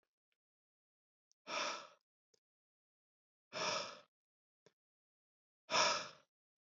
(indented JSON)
{
  "exhalation_length": "6.7 s",
  "exhalation_amplitude": 3641,
  "exhalation_signal_mean_std_ratio": 0.3,
  "survey_phase": "beta (2021-08-13 to 2022-03-07)",
  "age": "45-64",
  "gender": "Male",
  "wearing_mask": "No",
  "symptom_none": true,
  "symptom_onset": "7 days",
  "smoker_status": "Never smoked",
  "respiratory_condition_asthma": false,
  "respiratory_condition_other": false,
  "recruitment_source": "REACT",
  "submission_delay": "2 days",
  "covid_test_result": "Positive",
  "covid_test_method": "RT-qPCR",
  "covid_ct_value": 26.2,
  "covid_ct_gene": "E gene",
  "influenza_a_test_result": "Negative",
  "influenza_b_test_result": "Negative"
}